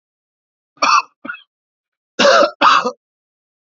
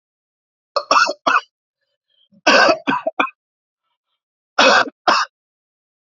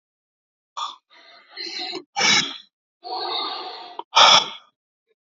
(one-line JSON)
{"cough_length": "3.7 s", "cough_amplitude": 29978, "cough_signal_mean_std_ratio": 0.39, "three_cough_length": "6.1 s", "three_cough_amplitude": 31243, "three_cough_signal_mean_std_ratio": 0.38, "exhalation_length": "5.2 s", "exhalation_amplitude": 29041, "exhalation_signal_mean_std_ratio": 0.38, "survey_phase": "alpha (2021-03-01 to 2021-08-12)", "age": "18-44", "gender": "Male", "wearing_mask": "Yes", "symptom_none": true, "smoker_status": "Never smoked", "respiratory_condition_asthma": false, "respiratory_condition_other": false, "recruitment_source": "REACT", "submission_delay": "3 days", "covid_test_result": "Negative", "covid_test_method": "RT-qPCR"}